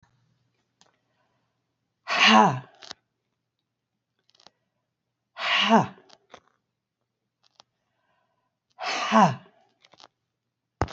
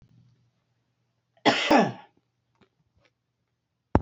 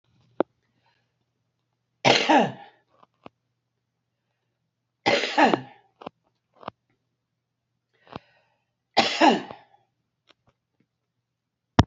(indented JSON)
{
  "exhalation_length": "10.9 s",
  "exhalation_amplitude": 24788,
  "exhalation_signal_mean_std_ratio": 0.27,
  "cough_length": "4.0 s",
  "cough_amplitude": 27611,
  "cough_signal_mean_std_ratio": 0.26,
  "three_cough_length": "11.9 s",
  "three_cough_amplitude": 28794,
  "three_cough_signal_mean_std_ratio": 0.25,
  "survey_phase": "beta (2021-08-13 to 2022-03-07)",
  "age": "65+",
  "gender": "Female",
  "wearing_mask": "No",
  "symptom_none": true,
  "smoker_status": "Never smoked",
  "respiratory_condition_asthma": true,
  "respiratory_condition_other": false,
  "recruitment_source": "REACT",
  "submission_delay": "2 days",
  "covid_test_result": "Negative",
  "covid_test_method": "RT-qPCR",
  "influenza_a_test_result": "Negative",
  "influenza_b_test_result": "Negative"
}